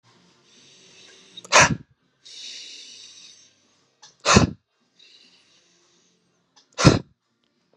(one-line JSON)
{"exhalation_length": "7.8 s", "exhalation_amplitude": 31839, "exhalation_signal_mean_std_ratio": 0.24, "survey_phase": "beta (2021-08-13 to 2022-03-07)", "age": "18-44", "gender": "Male", "wearing_mask": "No", "symptom_none": true, "smoker_status": "Ex-smoker", "respiratory_condition_asthma": false, "respiratory_condition_other": false, "recruitment_source": "REACT", "submission_delay": "3 days", "covid_test_result": "Negative", "covid_test_method": "RT-qPCR"}